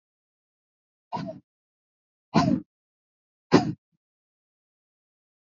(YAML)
exhalation_length: 5.5 s
exhalation_amplitude: 23546
exhalation_signal_mean_std_ratio: 0.22
survey_phase: beta (2021-08-13 to 2022-03-07)
age: 18-44
gender: Female
wearing_mask: 'No'
symptom_cough_any: true
symptom_sore_throat: true
symptom_fatigue: true
symptom_onset: 12 days
smoker_status: Ex-smoker
respiratory_condition_asthma: true
respiratory_condition_other: false
recruitment_source: REACT
submission_delay: 8 days
covid_test_result: Negative
covid_test_method: RT-qPCR
influenza_a_test_result: Negative
influenza_b_test_result: Negative